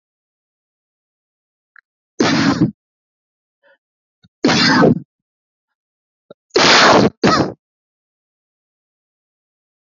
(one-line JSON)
{"three_cough_length": "9.8 s", "three_cough_amplitude": 32768, "three_cough_signal_mean_std_ratio": 0.36, "survey_phase": "alpha (2021-03-01 to 2021-08-12)", "age": "45-64", "gender": "Male", "wearing_mask": "No", "symptom_cough_any": true, "symptom_fatigue": true, "symptom_headache": true, "symptom_onset": "6 days", "smoker_status": "Ex-smoker", "respiratory_condition_asthma": true, "respiratory_condition_other": true, "recruitment_source": "Test and Trace", "submission_delay": "3 days", "covid_test_result": "Positive", "covid_test_method": "RT-qPCR"}